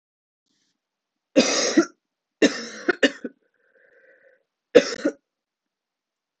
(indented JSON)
{
  "three_cough_length": "6.4 s",
  "three_cough_amplitude": 26028,
  "three_cough_signal_mean_std_ratio": 0.28,
  "survey_phase": "alpha (2021-03-01 to 2021-08-12)",
  "age": "18-44",
  "gender": "Female",
  "wearing_mask": "No",
  "symptom_cough_any": true,
  "symptom_new_continuous_cough": true,
  "symptom_shortness_of_breath": true,
  "symptom_fatigue": true,
  "symptom_fever_high_temperature": true,
  "symptom_headache": true,
  "symptom_change_to_sense_of_smell_or_taste": true,
  "symptom_loss_of_taste": true,
  "symptom_onset": "3 days",
  "smoker_status": "Never smoked",
  "respiratory_condition_asthma": true,
  "respiratory_condition_other": false,
  "recruitment_source": "Test and Trace",
  "submission_delay": "2 days",
  "covid_test_result": "Positive",
  "covid_test_method": "RT-qPCR"
}